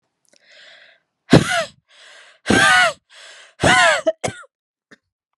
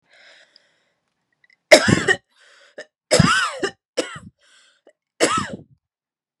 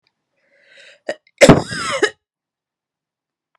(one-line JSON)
{"exhalation_length": "5.4 s", "exhalation_amplitude": 32768, "exhalation_signal_mean_std_ratio": 0.39, "three_cough_length": "6.4 s", "three_cough_amplitude": 32768, "three_cough_signal_mean_std_ratio": 0.31, "cough_length": "3.6 s", "cough_amplitude": 32768, "cough_signal_mean_std_ratio": 0.25, "survey_phase": "beta (2021-08-13 to 2022-03-07)", "age": "18-44", "gender": "Female", "wearing_mask": "No", "symptom_sore_throat": true, "symptom_fatigue": true, "symptom_headache": true, "symptom_onset": "7 days", "smoker_status": "Never smoked", "respiratory_condition_asthma": false, "respiratory_condition_other": false, "recruitment_source": "REACT", "submission_delay": "1 day", "covid_test_result": "Negative", "covid_test_method": "RT-qPCR"}